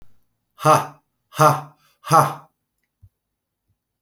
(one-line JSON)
{"exhalation_length": "4.0 s", "exhalation_amplitude": 29983, "exhalation_signal_mean_std_ratio": 0.31, "survey_phase": "alpha (2021-03-01 to 2021-08-12)", "age": "45-64", "gender": "Male", "wearing_mask": "No", "symptom_none": true, "smoker_status": "Current smoker (11 or more cigarettes per day)", "respiratory_condition_asthma": false, "respiratory_condition_other": false, "recruitment_source": "REACT", "submission_delay": "1 day", "covid_test_result": "Negative", "covid_test_method": "RT-qPCR"}